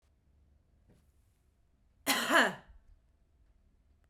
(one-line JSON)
{"cough_length": "4.1 s", "cough_amplitude": 8469, "cough_signal_mean_std_ratio": 0.27, "survey_phase": "beta (2021-08-13 to 2022-03-07)", "age": "45-64", "gender": "Female", "wearing_mask": "No", "symptom_prefer_not_to_say": true, "symptom_onset": "3 days", "smoker_status": "Ex-smoker", "respiratory_condition_asthma": false, "respiratory_condition_other": false, "recruitment_source": "Test and Trace", "submission_delay": "1 day", "covid_test_result": "Positive", "covid_test_method": "RT-qPCR", "covid_ct_value": 30.0, "covid_ct_gene": "N gene", "covid_ct_mean": 30.0, "covid_viral_load": "140 copies/ml", "covid_viral_load_category": "Minimal viral load (< 10K copies/ml)"}